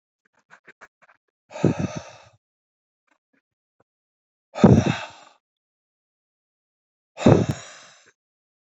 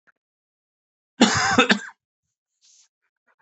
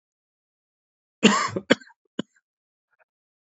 {"exhalation_length": "8.8 s", "exhalation_amplitude": 27325, "exhalation_signal_mean_std_ratio": 0.23, "cough_length": "3.4 s", "cough_amplitude": 27766, "cough_signal_mean_std_ratio": 0.3, "three_cough_length": "3.5 s", "three_cough_amplitude": 26691, "three_cough_signal_mean_std_ratio": 0.22, "survey_phase": "beta (2021-08-13 to 2022-03-07)", "age": "45-64", "gender": "Male", "wearing_mask": "No", "symptom_new_continuous_cough": true, "symptom_onset": "5 days", "smoker_status": "Ex-smoker", "respiratory_condition_asthma": false, "respiratory_condition_other": false, "recruitment_source": "REACT", "submission_delay": "1 day", "covid_test_result": "Negative", "covid_test_method": "RT-qPCR", "influenza_a_test_result": "Negative", "influenza_b_test_result": "Negative"}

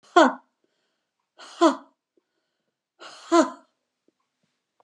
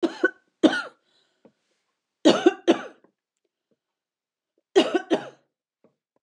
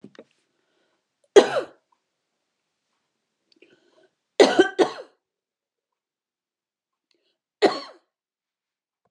{"exhalation_length": "4.8 s", "exhalation_amplitude": 26918, "exhalation_signal_mean_std_ratio": 0.24, "cough_length": "6.2 s", "cough_amplitude": 24073, "cough_signal_mean_std_ratio": 0.28, "three_cough_length": "9.1 s", "three_cough_amplitude": 31838, "three_cough_signal_mean_std_ratio": 0.19, "survey_phase": "beta (2021-08-13 to 2022-03-07)", "age": "45-64", "gender": "Female", "wearing_mask": "No", "symptom_none": true, "smoker_status": "Current smoker (1 to 10 cigarettes per day)", "respiratory_condition_asthma": false, "respiratory_condition_other": false, "recruitment_source": "REACT", "submission_delay": "3 days", "covid_test_result": "Negative", "covid_test_method": "RT-qPCR", "influenza_a_test_result": "Negative", "influenza_b_test_result": "Negative"}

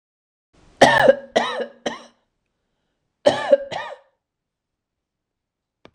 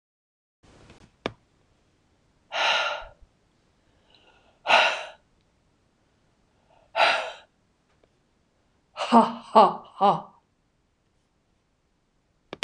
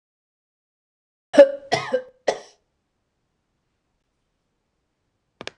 {"cough_length": "5.9 s", "cough_amplitude": 26028, "cough_signal_mean_std_ratio": 0.29, "exhalation_length": "12.6 s", "exhalation_amplitude": 22853, "exhalation_signal_mean_std_ratio": 0.28, "three_cough_length": "5.6 s", "three_cough_amplitude": 26028, "three_cough_signal_mean_std_ratio": 0.18, "survey_phase": "beta (2021-08-13 to 2022-03-07)", "age": "45-64", "gender": "Female", "wearing_mask": "No", "symptom_none": true, "smoker_status": "Never smoked", "respiratory_condition_asthma": false, "respiratory_condition_other": false, "recruitment_source": "REACT", "submission_delay": "33 days", "covid_test_result": "Negative", "covid_test_method": "RT-qPCR", "influenza_a_test_result": "Negative", "influenza_b_test_result": "Negative"}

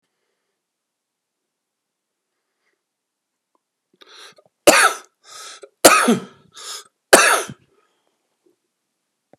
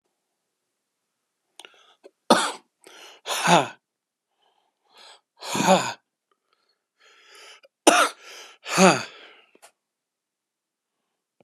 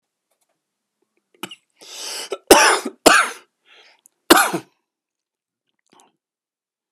{"three_cough_length": "9.4 s", "three_cough_amplitude": 32768, "three_cough_signal_mean_std_ratio": 0.24, "exhalation_length": "11.4 s", "exhalation_amplitude": 32765, "exhalation_signal_mean_std_ratio": 0.27, "cough_length": "6.9 s", "cough_amplitude": 32768, "cough_signal_mean_std_ratio": 0.27, "survey_phase": "beta (2021-08-13 to 2022-03-07)", "age": "45-64", "gender": "Male", "wearing_mask": "No", "symptom_runny_or_blocked_nose": true, "symptom_shortness_of_breath": true, "symptom_fatigue": true, "smoker_status": "Never smoked", "respiratory_condition_asthma": true, "respiratory_condition_other": false, "recruitment_source": "REACT", "submission_delay": "3 days", "covid_test_result": "Negative", "covid_test_method": "RT-qPCR"}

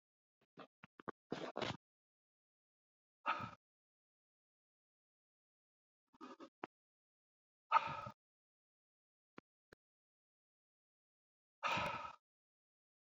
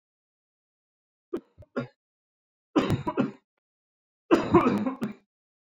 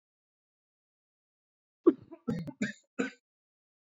{"exhalation_length": "13.1 s", "exhalation_amplitude": 3616, "exhalation_signal_mean_std_ratio": 0.23, "three_cough_length": "5.6 s", "three_cough_amplitude": 15407, "three_cough_signal_mean_std_ratio": 0.35, "cough_length": "3.9 s", "cough_amplitude": 9358, "cough_signal_mean_std_ratio": 0.21, "survey_phase": "beta (2021-08-13 to 2022-03-07)", "age": "45-64", "gender": "Male", "wearing_mask": "No", "symptom_none": true, "smoker_status": "Never smoked", "respiratory_condition_asthma": false, "respiratory_condition_other": false, "recruitment_source": "REACT", "submission_delay": "1 day", "covid_test_result": "Negative", "covid_test_method": "RT-qPCR"}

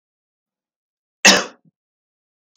{"cough_length": "2.6 s", "cough_amplitude": 32768, "cough_signal_mean_std_ratio": 0.2, "survey_phase": "beta (2021-08-13 to 2022-03-07)", "age": "18-44", "gender": "Male", "wearing_mask": "No", "symptom_cough_any": true, "symptom_runny_or_blocked_nose": true, "symptom_sore_throat": true, "symptom_fatigue": true, "symptom_onset": "5 days", "smoker_status": "Never smoked", "respiratory_condition_asthma": false, "respiratory_condition_other": false, "recruitment_source": "Test and Trace", "submission_delay": "2 days", "covid_test_result": "Positive", "covid_test_method": "RT-qPCR", "covid_ct_value": 19.2, "covid_ct_gene": "N gene", "covid_ct_mean": 19.4, "covid_viral_load": "440000 copies/ml", "covid_viral_load_category": "Low viral load (10K-1M copies/ml)"}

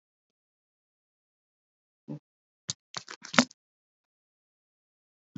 {"cough_length": "5.4 s", "cough_amplitude": 32768, "cough_signal_mean_std_ratio": 0.11, "survey_phase": "beta (2021-08-13 to 2022-03-07)", "age": "65+", "gender": "Female", "wearing_mask": "No", "symptom_none": true, "smoker_status": "Never smoked", "respiratory_condition_asthma": false, "respiratory_condition_other": false, "recruitment_source": "REACT", "submission_delay": "2 days", "covid_test_result": "Positive", "covid_test_method": "RT-qPCR", "covid_ct_value": 24.0, "covid_ct_gene": "E gene", "influenza_a_test_result": "Negative", "influenza_b_test_result": "Negative"}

